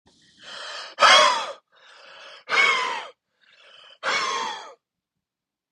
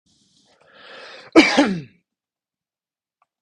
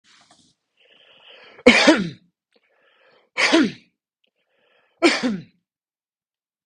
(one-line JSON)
{"exhalation_length": "5.7 s", "exhalation_amplitude": 24961, "exhalation_signal_mean_std_ratio": 0.4, "cough_length": "3.4 s", "cough_amplitude": 32768, "cough_signal_mean_std_ratio": 0.26, "three_cough_length": "6.7 s", "three_cough_amplitude": 32768, "three_cough_signal_mean_std_ratio": 0.3, "survey_phase": "beta (2021-08-13 to 2022-03-07)", "age": "18-44", "gender": "Male", "wearing_mask": "No", "symptom_none": true, "smoker_status": "Never smoked", "respiratory_condition_asthma": false, "respiratory_condition_other": false, "recruitment_source": "REACT", "submission_delay": "2 days", "covid_test_result": "Negative", "covid_test_method": "RT-qPCR", "influenza_a_test_result": "Negative", "influenza_b_test_result": "Negative"}